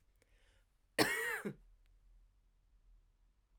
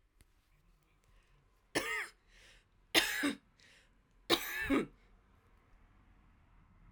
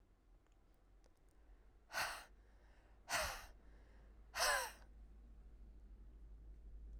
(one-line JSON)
{"cough_length": "3.6 s", "cough_amplitude": 4935, "cough_signal_mean_std_ratio": 0.31, "three_cough_length": "6.9 s", "three_cough_amplitude": 7479, "three_cough_signal_mean_std_ratio": 0.33, "exhalation_length": "7.0 s", "exhalation_amplitude": 1922, "exhalation_signal_mean_std_ratio": 0.47, "survey_phase": "alpha (2021-03-01 to 2021-08-12)", "age": "18-44", "gender": "Female", "wearing_mask": "No", "symptom_cough_any": true, "symptom_abdominal_pain": true, "symptom_fatigue": true, "symptom_headache": true, "smoker_status": "Ex-smoker", "respiratory_condition_asthma": false, "respiratory_condition_other": false, "recruitment_source": "Test and Trace", "submission_delay": "2 days", "covid_test_result": "Positive", "covid_test_method": "RT-qPCR", "covid_ct_value": 15.1, "covid_ct_gene": "S gene", "covid_ct_mean": 15.2, "covid_viral_load": "10000000 copies/ml", "covid_viral_load_category": "High viral load (>1M copies/ml)"}